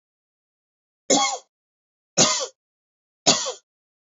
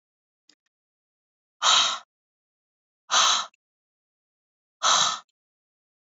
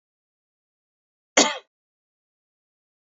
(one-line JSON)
{"three_cough_length": "4.0 s", "three_cough_amplitude": 31043, "three_cough_signal_mean_std_ratio": 0.33, "exhalation_length": "6.1 s", "exhalation_amplitude": 15480, "exhalation_signal_mean_std_ratio": 0.32, "cough_length": "3.1 s", "cough_amplitude": 32768, "cough_signal_mean_std_ratio": 0.16, "survey_phase": "beta (2021-08-13 to 2022-03-07)", "age": "45-64", "gender": "Female", "wearing_mask": "No", "symptom_none": true, "smoker_status": "Never smoked", "respiratory_condition_asthma": false, "respiratory_condition_other": false, "recruitment_source": "REACT", "submission_delay": "8 days", "covid_test_result": "Negative", "covid_test_method": "RT-qPCR", "influenza_a_test_result": "Negative", "influenza_b_test_result": "Negative"}